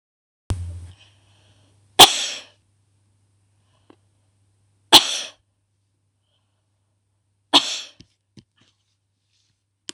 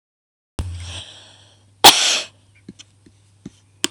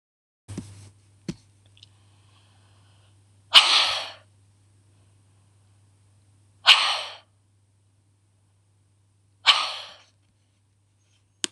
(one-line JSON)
{"three_cough_length": "9.9 s", "three_cough_amplitude": 26028, "three_cough_signal_mean_std_ratio": 0.19, "cough_length": "3.9 s", "cough_amplitude": 26028, "cough_signal_mean_std_ratio": 0.27, "exhalation_length": "11.5 s", "exhalation_amplitude": 26028, "exhalation_signal_mean_std_ratio": 0.23, "survey_phase": "beta (2021-08-13 to 2022-03-07)", "age": "45-64", "gender": "Female", "wearing_mask": "No", "symptom_none": true, "symptom_onset": "13 days", "smoker_status": "Ex-smoker", "respiratory_condition_asthma": true, "respiratory_condition_other": false, "recruitment_source": "REACT", "submission_delay": "2 days", "covid_test_result": "Negative", "covid_test_method": "RT-qPCR", "influenza_a_test_result": "Negative", "influenza_b_test_result": "Negative"}